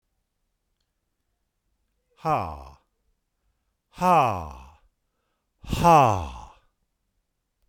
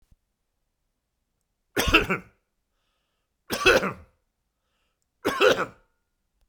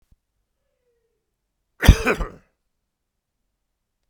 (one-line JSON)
{"exhalation_length": "7.7 s", "exhalation_amplitude": 17797, "exhalation_signal_mean_std_ratio": 0.3, "three_cough_length": "6.5 s", "three_cough_amplitude": 28596, "three_cough_signal_mean_std_ratio": 0.3, "cough_length": "4.1 s", "cough_amplitude": 32768, "cough_signal_mean_std_ratio": 0.17, "survey_phase": "beta (2021-08-13 to 2022-03-07)", "age": "45-64", "gender": "Male", "wearing_mask": "No", "symptom_none": true, "smoker_status": "Never smoked", "respiratory_condition_asthma": false, "respiratory_condition_other": false, "recruitment_source": "REACT", "submission_delay": "0 days", "covid_test_result": "Negative", "covid_test_method": "RT-qPCR"}